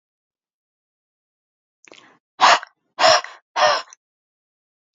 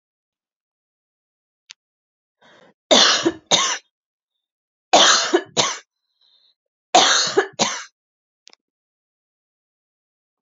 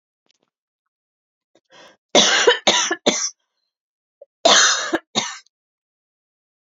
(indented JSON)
{
  "exhalation_length": "4.9 s",
  "exhalation_amplitude": 30173,
  "exhalation_signal_mean_std_ratio": 0.28,
  "three_cough_length": "10.4 s",
  "three_cough_amplitude": 32768,
  "three_cough_signal_mean_std_ratio": 0.32,
  "cough_length": "6.7 s",
  "cough_amplitude": 30988,
  "cough_signal_mean_std_ratio": 0.36,
  "survey_phase": "alpha (2021-03-01 to 2021-08-12)",
  "age": "18-44",
  "gender": "Female",
  "wearing_mask": "No",
  "symptom_none": true,
  "smoker_status": "Never smoked",
  "respiratory_condition_asthma": true,
  "respiratory_condition_other": false,
  "recruitment_source": "REACT",
  "submission_delay": "3 days",
  "covid_test_result": "Negative",
  "covid_test_method": "RT-qPCR"
}